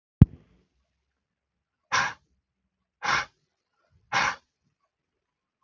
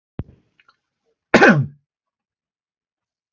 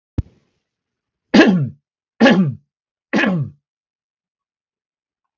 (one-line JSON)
{"exhalation_length": "5.6 s", "exhalation_amplitude": 32570, "exhalation_signal_mean_std_ratio": 0.2, "cough_length": "3.3 s", "cough_amplitude": 32767, "cough_signal_mean_std_ratio": 0.24, "three_cough_length": "5.4 s", "three_cough_amplitude": 32767, "three_cough_signal_mean_std_ratio": 0.34, "survey_phase": "beta (2021-08-13 to 2022-03-07)", "age": "18-44", "gender": "Male", "wearing_mask": "No", "symptom_none": true, "smoker_status": "Ex-smoker", "respiratory_condition_asthma": false, "respiratory_condition_other": false, "recruitment_source": "REACT", "submission_delay": "0 days", "covid_test_result": "Negative", "covid_test_method": "RT-qPCR", "influenza_a_test_result": "Unknown/Void", "influenza_b_test_result": "Unknown/Void"}